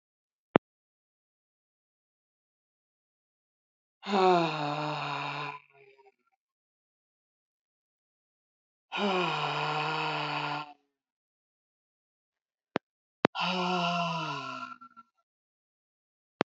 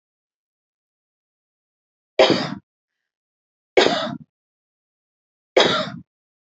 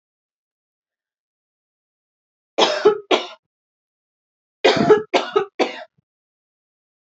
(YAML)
exhalation_length: 16.5 s
exhalation_amplitude: 27407
exhalation_signal_mean_std_ratio: 0.38
three_cough_length: 6.6 s
three_cough_amplitude: 30772
three_cough_signal_mean_std_ratio: 0.27
cough_length: 7.1 s
cough_amplitude: 28736
cough_signal_mean_std_ratio: 0.3
survey_phase: alpha (2021-03-01 to 2021-08-12)
age: 45-64
gender: Female
wearing_mask: 'Yes'
symptom_none: true
smoker_status: Current smoker (11 or more cigarettes per day)
respiratory_condition_asthma: false
respiratory_condition_other: false
recruitment_source: REACT
submission_delay: 2 days
covid_test_result: Negative
covid_test_method: RT-qPCR